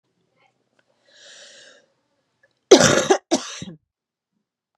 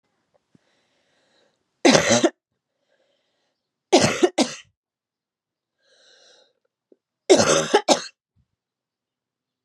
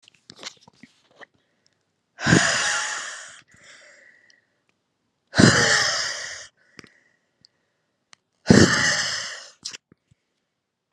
{"cough_length": "4.8 s", "cough_amplitude": 32768, "cough_signal_mean_std_ratio": 0.24, "three_cough_length": "9.6 s", "three_cough_amplitude": 29993, "three_cough_signal_mean_std_ratio": 0.29, "exhalation_length": "10.9 s", "exhalation_amplitude": 32767, "exhalation_signal_mean_std_ratio": 0.35, "survey_phase": "beta (2021-08-13 to 2022-03-07)", "age": "18-44", "gender": "Female", "wearing_mask": "No", "symptom_cough_any": true, "symptom_runny_or_blocked_nose": true, "symptom_onset": "7 days", "smoker_status": "Never smoked", "respiratory_condition_asthma": false, "respiratory_condition_other": false, "recruitment_source": "REACT", "submission_delay": "1 day", "covid_test_result": "Negative", "covid_test_method": "RT-qPCR"}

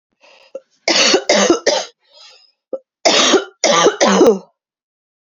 {"three_cough_length": "5.2 s", "three_cough_amplitude": 32768, "three_cough_signal_mean_std_ratio": 0.53, "survey_phase": "beta (2021-08-13 to 2022-03-07)", "age": "18-44", "gender": "Female", "wearing_mask": "No", "symptom_cough_any": true, "symptom_runny_or_blocked_nose": true, "symptom_shortness_of_breath": true, "symptom_fatigue": true, "symptom_headache": true, "symptom_change_to_sense_of_smell_or_taste": true, "symptom_loss_of_taste": true, "symptom_onset": "4 days", "smoker_status": "Ex-smoker", "respiratory_condition_asthma": false, "respiratory_condition_other": false, "recruitment_source": "Test and Trace", "submission_delay": "3 days", "covid_test_result": "Positive", "covid_test_method": "RT-qPCR", "covid_ct_value": 15.9, "covid_ct_gene": "ORF1ab gene", "covid_ct_mean": 16.1, "covid_viral_load": "5300000 copies/ml", "covid_viral_load_category": "High viral load (>1M copies/ml)"}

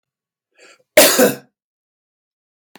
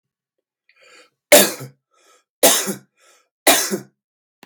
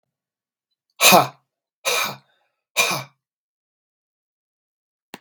{"cough_length": "2.8 s", "cough_amplitude": 32768, "cough_signal_mean_std_ratio": 0.29, "three_cough_length": "4.5 s", "three_cough_amplitude": 32768, "three_cough_signal_mean_std_ratio": 0.31, "exhalation_length": "5.2 s", "exhalation_amplitude": 32768, "exhalation_signal_mean_std_ratio": 0.26, "survey_phase": "beta (2021-08-13 to 2022-03-07)", "age": "45-64", "gender": "Male", "wearing_mask": "No", "symptom_runny_or_blocked_nose": true, "symptom_fatigue": true, "symptom_headache": true, "smoker_status": "Never smoked", "respiratory_condition_asthma": false, "respiratory_condition_other": false, "recruitment_source": "Test and Trace", "submission_delay": "2 days", "covid_test_result": "Positive", "covid_test_method": "RT-qPCR", "covid_ct_value": 23.1, "covid_ct_gene": "N gene", "covid_ct_mean": 23.8, "covid_viral_load": "15000 copies/ml", "covid_viral_load_category": "Low viral load (10K-1M copies/ml)"}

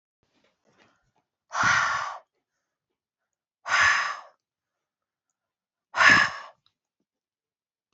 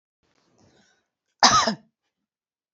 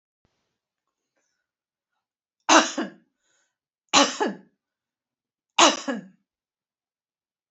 {"exhalation_length": "7.9 s", "exhalation_amplitude": 21415, "exhalation_signal_mean_std_ratio": 0.32, "cough_length": "2.7 s", "cough_amplitude": 31693, "cough_signal_mean_std_ratio": 0.25, "three_cough_length": "7.5 s", "three_cough_amplitude": 28137, "three_cough_signal_mean_std_ratio": 0.24, "survey_phase": "beta (2021-08-13 to 2022-03-07)", "age": "65+", "gender": "Female", "wearing_mask": "No", "symptom_none": true, "smoker_status": "Never smoked", "respiratory_condition_asthma": false, "respiratory_condition_other": false, "recruitment_source": "REACT", "submission_delay": "2 days", "covid_test_result": "Negative", "covid_test_method": "RT-qPCR", "influenza_a_test_result": "Negative", "influenza_b_test_result": "Negative"}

